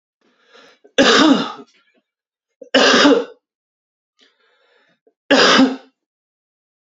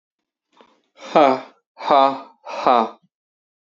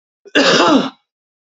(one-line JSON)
{"three_cough_length": "6.8 s", "three_cough_amplitude": 31411, "three_cough_signal_mean_std_ratio": 0.38, "exhalation_length": "3.8 s", "exhalation_amplitude": 27860, "exhalation_signal_mean_std_ratio": 0.36, "cough_length": "1.5 s", "cough_amplitude": 30740, "cough_signal_mean_std_ratio": 0.51, "survey_phase": "beta (2021-08-13 to 2022-03-07)", "age": "18-44", "gender": "Male", "wearing_mask": "No", "symptom_none": true, "smoker_status": "Never smoked", "respiratory_condition_asthma": false, "respiratory_condition_other": false, "recruitment_source": "REACT", "submission_delay": "3 days", "covid_test_result": "Negative", "covid_test_method": "RT-qPCR", "influenza_a_test_result": "Negative", "influenza_b_test_result": "Negative"}